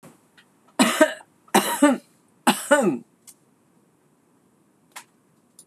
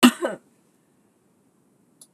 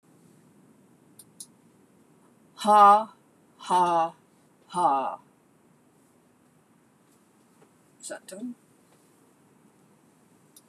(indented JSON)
{
  "three_cough_length": "5.7 s",
  "three_cough_amplitude": 26027,
  "three_cough_signal_mean_std_ratio": 0.34,
  "cough_length": "2.1 s",
  "cough_amplitude": 26027,
  "cough_signal_mean_std_ratio": 0.21,
  "exhalation_length": "10.7 s",
  "exhalation_amplitude": 17252,
  "exhalation_signal_mean_std_ratio": 0.28,
  "survey_phase": "beta (2021-08-13 to 2022-03-07)",
  "age": "65+",
  "gender": "Female",
  "wearing_mask": "No",
  "symptom_runny_or_blocked_nose": true,
  "smoker_status": "Never smoked",
  "respiratory_condition_asthma": false,
  "respiratory_condition_other": false,
  "recruitment_source": "REACT",
  "submission_delay": "1 day",
  "covid_test_result": "Negative",
  "covid_test_method": "RT-qPCR"
}